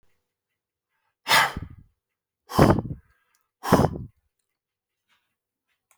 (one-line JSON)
{"exhalation_length": "6.0 s", "exhalation_amplitude": 24777, "exhalation_signal_mean_std_ratio": 0.28, "survey_phase": "beta (2021-08-13 to 2022-03-07)", "age": "45-64", "gender": "Male", "wearing_mask": "No", "symptom_none": true, "smoker_status": "Never smoked", "respiratory_condition_asthma": false, "respiratory_condition_other": false, "recruitment_source": "REACT", "submission_delay": "1 day", "covid_test_result": "Negative", "covid_test_method": "RT-qPCR"}